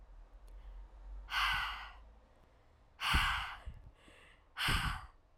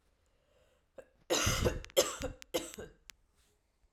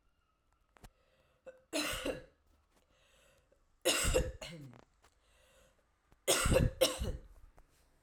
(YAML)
exhalation_length: 5.4 s
exhalation_amplitude: 4184
exhalation_signal_mean_std_ratio: 0.54
cough_length: 3.9 s
cough_amplitude: 7324
cough_signal_mean_std_ratio: 0.38
three_cough_length: 8.0 s
three_cough_amplitude: 5089
three_cough_signal_mean_std_ratio: 0.37
survey_phase: beta (2021-08-13 to 2022-03-07)
age: 18-44
gender: Female
wearing_mask: 'No'
symptom_cough_any: true
symptom_new_continuous_cough: true
symptom_runny_or_blocked_nose: true
symptom_sore_throat: true
symptom_fatigue: true
symptom_fever_high_temperature: true
symptom_headache: true
symptom_onset: 3 days
smoker_status: Never smoked
respiratory_condition_asthma: false
respiratory_condition_other: false
recruitment_source: Test and Trace
submission_delay: 2 days
covid_test_result: Positive
covid_test_method: RT-qPCR